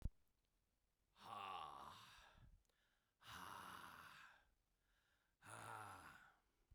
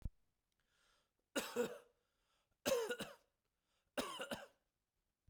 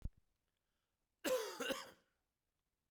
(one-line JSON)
{"exhalation_length": "6.7 s", "exhalation_amplitude": 787, "exhalation_signal_mean_std_ratio": 0.52, "three_cough_length": "5.3 s", "three_cough_amplitude": 1867, "three_cough_signal_mean_std_ratio": 0.36, "cough_length": "2.9 s", "cough_amplitude": 1610, "cough_signal_mean_std_ratio": 0.36, "survey_phase": "beta (2021-08-13 to 2022-03-07)", "age": "45-64", "gender": "Male", "wearing_mask": "No", "symptom_none": true, "smoker_status": "Never smoked", "respiratory_condition_asthma": false, "respiratory_condition_other": false, "recruitment_source": "Test and Trace", "submission_delay": "1 day", "covid_test_result": "Positive", "covid_test_method": "ePCR"}